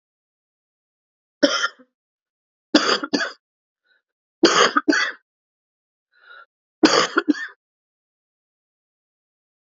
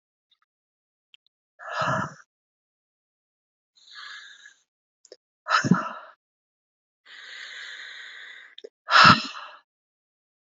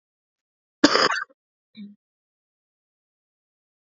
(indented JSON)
{
  "three_cough_length": "9.6 s",
  "three_cough_amplitude": 30804,
  "three_cough_signal_mean_std_ratio": 0.3,
  "exhalation_length": "10.6 s",
  "exhalation_amplitude": 26441,
  "exhalation_signal_mean_std_ratio": 0.24,
  "cough_length": "3.9 s",
  "cough_amplitude": 28674,
  "cough_signal_mean_std_ratio": 0.21,
  "survey_phase": "beta (2021-08-13 to 2022-03-07)",
  "age": "18-44",
  "gender": "Female",
  "wearing_mask": "No",
  "symptom_cough_any": true,
  "symptom_new_continuous_cough": true,
  "symptom_runny_or_blocked_nose": true,
  "symptom_sore_throat": true,
  "symptom_fatigue": true,
  "symptom_headache": true,
  "smoker_status": "Ex-smoker",
  "respiratory_condition_asthma": false,
  "respiratory_condition_other": false,
  "recruitment_source": "Test and Trace",
  "submission_delay": "-1 day",
  "covid_test_result": "Positive",
  "covid_test_method": "LFT"
}